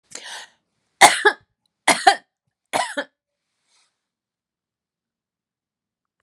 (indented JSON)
{
  "three_cough_length": "6.2 s",
  "three_cough_amplitude": 32768,
  "three_cough_signal_mean_std_ratio": 0.22,
  "survey_phase": "beta (2021-08-13 to 2022-03-07)",
  "age": "45-64",
  "gender": "Female",
  "wearing_mask": "No",
  "symptom_runny_or_blocked_nose": true,
  "smoker_status": "Never smoked",
  "respiratory_condition_asthma": false,
  "respiratory_condition_other": false,
  "recruitment_source": "REACT",
  "submission_delay": "5 days",
  "covid_test_result": "Negative",
  "covid_test_method": "RT-qPCR",
  "influenza_a_test_result": "Negative",
  "influenza_b_test_result": "Negative"
}